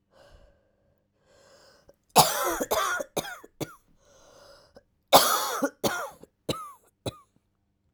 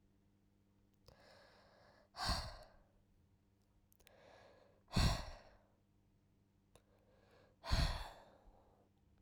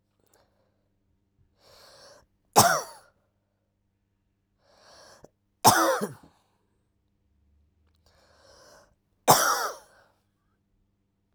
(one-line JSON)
{"cough_length": "7.9 s", "cough_amplitude": 26583, "cough_signal_mean_std_ratio": 0.34, "exhalation_length": "9.2 s", "exhalation_amplitude": 2656, "exhalation_signal_mean_std_ratio": 0.3, "three_cough_length": "11.3 s", "three_cough_amplitude": 26876, "three_cough_signal_mean_std_ratio": 0.24, "survey_phase": "alpha (2021-03-01 to 2021-08-12)", "age": "18-44", "gender": "Female", "wearing_mask": "No", "symptom_cough_any": true, "symptom_new_continuous_cough": true, "symptom_shortness_of_breath": true, "symptom_abdominal_pain": true, "symptom_diarrhoea": true, "symptom_fatigue": true, "symptom_fever_high_temperature": true, "symptom_headache": true, "smoker_status": "Ex-smoker", "respiratory_condition_asthma": false, "respiratory_condition_other": false, "recruitment_source": "Test and Trace", "submission_delay": "2 days", "covid_test_result": "Positive", "covid_test_method": "RT-qPCR", "covid_ct_value": 19.8, "covid_ct_gene": "N gene", "covid_ct_mean": 20.6, "covid_viral_load": "180000 copies/ml", "covid_viral_load_category": "Low viral load (10K-1M copies/ml)"}